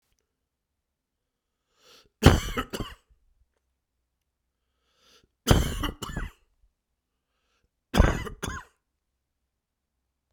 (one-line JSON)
{"three_cough_length": "10.3 s", "three_cough_amplitude": 31276, "three_cough_signal_mean_std_ratio": 0.23, "survey_phase": "beta (2021-08-13 to 2022-03-07)", "age": "45-64", "gender": "Male", "wearing_mask": "No", "symptom_cough_any": true, "symptom_runny_or_blocked_nose": true, "symptom_sore_throat": true, "symptom_fatigue": true, "symptom_headache": true, "symptom_onset": "4 days", "smoker_status": "Never smoked", "respiratory_condition_asthma": false, "respiratory_condition_other": false, "recruitment_source": "Test and Trace", "submission_delay": "2 days", "covid_test_result": "Positive", "covid_test_method": "RT-qPCR"}